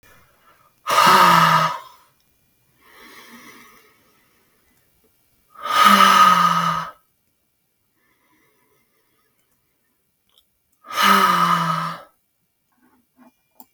{
  "exhalation_length": "13.7 s",
  "exhalation_amplitude": 32768,
  "exhalation_signal_mean_std_ratio": 0.39,
  "survey_phase": "beta (2021-08-13 to 2022-03-07)",
  "age": "45-64",
  "gender": "Female",
  "wearing_mask": "No",
  "symptom_none": true,
  "smoker_status": "Never smoked",
  "respiratory_condition_asthma": false,
  "respiratory_condition_other": false,
  "recruitment_source": "REACT",
  "submission_delay": "1 day",
  "covid_test_result": "Negative",
  "covid_test_method": "RT-qPCR",
  "influenza_a_test_result": "Negative",
  "influenza_b_test_result": "Negative"
}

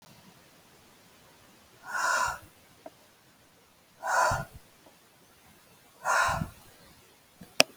{
  "exhalation_length": "7.8 s",
  "exhalation_amplitude": 32136,
  "exhalation_signal_mean_std_ratio": 0.35,
  "survey_phase": "alpha (2021-03-01 to 2021-08-12)",
  "age": "45-64",
  "gender": "Female",
  "wearing_mask": "No",
  "symptom_none": true,
  "smoker_status": "Ex-smoker",
  "respiratory_condition_asthma": false,
  "respiratory_condition_other": false,
  "recruitment_source": "REACT",
  "submission_delay": "2 days",
  "covid_test_result": "Negative",
  "covid_test_method": "RT-qPCR"
}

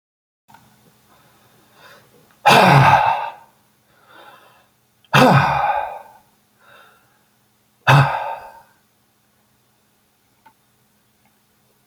{
  "exhalation_length": "11.9 s",
  "exhalation_amplitude": 30528,
  "exhalation_signal_mean_std_ratio": 0.33,
  "survey_phase": "beta (2021-08-13 to 2022-03-07)",
  "age": "45-64",
  "gender": "Male",
  "wearing_mask": "No",
  "symptom_none": true,
  "smoker_status": "Ex-smoker",
  "respiratory_condition_asthma": true,
  "respiratory_condition_other": false,
  "recruitment_source": "REACT",
  "submission_delay": "4 days",
  "covid_test_result": "Negative",
  "covid_test_method": "RT-qPCR"
}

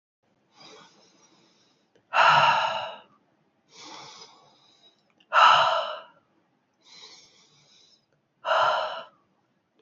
{
  "exhalation_length": "9.8 s",
  "exhalation_amplitude": 20654,
  "exhalation_signal_mean_std_ratio": 0.35,
  "survey_phase": "beta (2021-08-13 to 2022-03-07)",
  "age": "45-64",
  "gender": "Female",
  "wearing_mask": "No",
  "symptom_runny_or_blocked_nose": true,
  "symptom_sore_throat": true,
  "symptom_fatigue": true,
  "symptom_fever_high_temperature": true,
  "symptom_headache": true,
  "symptom_onset": "3 days",
  "smoker_status": "Current smoker (1 to 10 cigarettes per day)",
  "respiratory_condition_asthma": false,
  "respiratory_condition_other": false,
  "recruitment_source": "Test and Trace",
  "submission_delay": "2 days",
  "covid_test_result": "Positive",
  "covid_test_method": "ePCR"
}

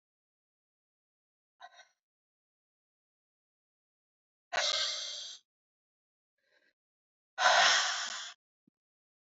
{
  "exhalation_length": "9.3 s",
  "exhalation_amplitude": 8278,
  "exhalation_signal_mean_std_ratio": 0.29,
  "survey_phase": "beta (2021-08-13 to 2022-03-07)",
  "age": "18-44",
  "gender": "Female",
  "wearing_mask": "No",
  "symptom_cough_any": true,
  "symptom_runny_or_blocked_nose": true,
  "symptom_fatigue": true,
  "symptom_headache": true,
  "symptom_onset": "3 days",
  "smoker_status": "Ex-smoker",
  "respiratory_condition_asthma": false,
  "respiratory_condition_other": false,
  "recruitment_source": "Test and Trace",
  "submission_delay": "2 days",
  "covid_test_result": "Positive",
  "covid_test_method": "RT-qPCR",
  "covid_ct_value": 19.9,
  "covid_ct_gene": "ORF1ab gene",
  "covid_ct_mean": 20.7,
  "covid_viral_load": "160000 copies/ml",
  "covid_viral_load_category": "Low viral load (10K-1M copies/ml)"
}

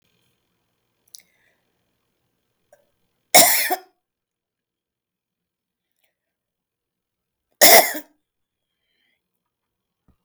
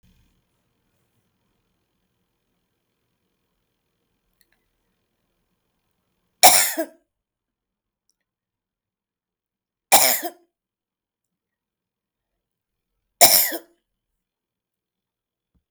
{
  "cough_length": "10.2 s",
  "cough_amplitude": 32768,
  "cough_signal_mean_std_ratio": 0.19,
  "three_cough_length": "15.7 s",
  "three_cough_amplitude": 32768,
  "three_cough_signal_mean_std_ratio": 0.18,
  "survey_phase": "beta (2021-08-13 to 2022-03-07)",
  "age": "45-64",
  "gender": "Female",
  "wearing_mask": "No",
  "symptom_none": true,
  "smoker_status": "Ex-smoker",
  "respiratory_condition_asthma": false,
  "respiratory_condition_other": false,
  "recruitment_source": "REACT",
  "submission_delay": "1 day",
  "covid_test_result": "Negative",
  "covid_test_method": "RT-qPCR",
  "influenza_a_test_result": "Negative",
  "influenza_b_test_result": "Negative"
}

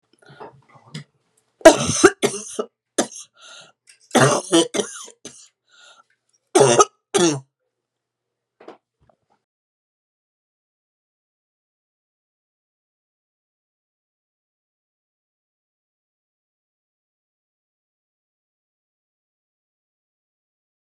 {
  "three_cough_length": "20.9 s",
  "three_cough_amplitude": 32768,
  "three_cough_signal_mean_std_ratio": 0.2,
  "survey_phase": "beta (2021-08-13 to 2022-03-07)",
  "age": "65+",
  "gender": "Female",
  "wearing_mask": "No",
  "symptom_cough_any": true,
  "symptom_runny_or_blocked_nose": true,
  "symptom_fatigue": true,
  "smoker_status": "Never smoked",
  "respiratory_condition_asthma": false,
  "respiratory_condition_other": true,
  "recruitment_source": "Test and Trace",
  "submission_delay": "2 days",
  "covid_test_result": "Positive",
  "covid_test_method": "RT-qPCR"
}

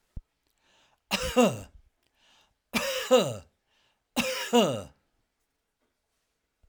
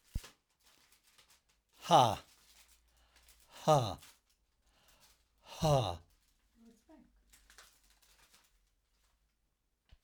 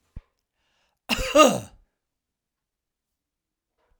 {
  "three_cough_length": "6.7 s",
  "three_cough_amplitude": 12532,
  "three_cough_signal_mean_std_ratio": 0.36,
  "exhalation_length": "10.0 s",
  "exhalation_amplitude": 8677,
  "exhalation_signal_mean_std_ratio": 0.24,
  "cough_length": "4.0 s",
  "cough_amplitude": 28358,
  "cough_signal_mean_std_ratio": 0.23,
  "survey_phase": "alpha (2021-03-01 to 2021-08-12)",
  "age": "65+",
  "gender": "Male",
  "wearing_mask": "No",
  "symptom_none": true,
  "smoker_status": "Ex-smoker",
  "respiratory_condition_asthma": false,
  "respiratory_condition_other": false,
  "recruitment_source": "REACT",
  "submission_delay": "2 days",
  "covid_test_result": "Negative",
  "covid_test_method": "RT-qPCR"
}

